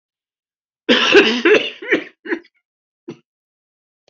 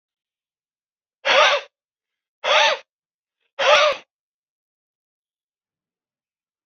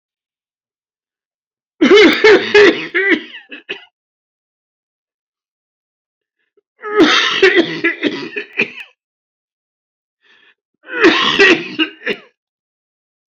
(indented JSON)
{
  "cough_length": "4.1 s",
  "cough_amplitude": 32768,
  "cough_signal_mean_std_ratio": 0.38,
  "exhalation_length": "6.7 s",
  "exhalation_amplitude": 26119,
  "exhalation_signal_mean_std_ratio": 0.31,
  "three_cough_length": "13.3 s",
  "three_cough_amplitude": 29523,
  "three_cough_signal_mean_std_ratio": 0.4,
  "survey_phase": "beta (2021-08-13 to 2022-03-07)",
  "age": "45-64",
  "gender": "Male",
  "wearing_mask": "No",
  "symptom_cough_any": true,
  "symptom_runny_or_blocked_nose": true,
  "symptom_fever_high_temperature": true,
  "symptom_headache": true,
  "symptom_onset": "2 days",
  "smoker_status": "Never smoked",
  "respiratory_condition_asthma": false,
  "respiratory_condition_other": false,
  "recruitment_source": "Test and Trace",
  "submission_delay": "2 days",
  "covid_test_result": "Positive",
  "covid_test_method": "RT-qPCR",
  "covid_ct_value": 14.5,
  "covid_ct_gene": "ORF1ab gene",
  "covid_ct_mean": 15.0,
  "covid_viral_load": "12000000 copies/ml",
  "covid_viral_load_category": "High viral load (>1M copies/ml)"
}